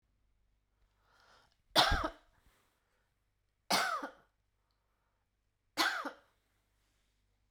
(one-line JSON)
{"three_cough_length": "7.5 s", "three_cough_amplitude": 7842, "three_cough_signal_mean_std_ratio": 0.28, "survey_phase": "beta (2021-08-13 to 2022-03-07)", "age": "45-64", "gender": "Female", "wearing_mask": "No", "symptom_new_continuous_cough": true, "symptom_abdominal_pain": true, "symptom_fatigue": true, "symptom_headache": true, "symptom_onset": "3 days", "smoker_status": "Never smoked", "respiratory_condition_asthma": false, "respiratory_condition_other": false, "recruitment_source": "Test and Trace", "submission_delay": "2 days", "covid_test_result": "Positive", "covid_test_method": "RT-qPCR", "covid_ct_value": 15.7, "covid_ct_gene": "S gene", "covid_ct_mean": 16.1, "covid_viral_load": "5300000 copies/ml", "covid_viral_load_category": "High viral load (>1M copies/ml)"}